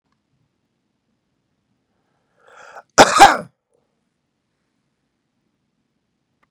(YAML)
cough_length: 6.5 s
cough_amplitude: 32768
cough_signal_mean_std_ratio: 0.17
survey_phase: beta (2021-08-13 to 2022-03-07)
age: 65+
gender: Male
wearing_mask: 'No'
symptom_runny_or_blocked_nose: true
symptom_sore_throat: true
symptom_onset: 6 days
smoker_status: Never smoked
respiratory_condition_asthma: false
respiratory_condition_other: false
recruitment_source: Test and Trace
submission_delay: 2 days
covid_test_result: Positive
covid_test_method: RT-qPCR
covid_ct_value: 12.6
covid_ct_gene: ORF1ab gene
covid_ct_mean: 13.0
covid_viral_load: 56000000 copies/ml
covid_viral_load_category: High viral load (>1M copies/ml)